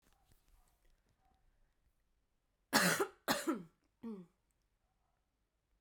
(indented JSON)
{
  "cough_length": "5.8 s",
  "cough_amplitude": 6547,
  "cough_signal_mean_std_ratio": 0.27,
  "survey_phase": "beta (2021-08-13 to 2022-03-07)",
  "age": "18-44",
  "gender": "Female",
  "wearing_mask": "No",
  "symptom_cough_any": true,
  "symptom_runny_or_blocked_nose": true,
  "symptom_change_to_sense_of_smell_or_taste": true,
  "symptom_loss_of_taste": true,
  "smoker_status": "Ex-smoker",
  "respiratory_condition_asthma": false,
  "respiratory_condition_other": false,
  "recruitment_source": "Test and Trace",
  "submission_delay": "2 days",
  "covid_test_result": "Positive",
  "covid_test_method": "RT-qPCR",
  "covid_ct_value": 21.7,
  "covid_ct_gene": "ORF1ab gene"
}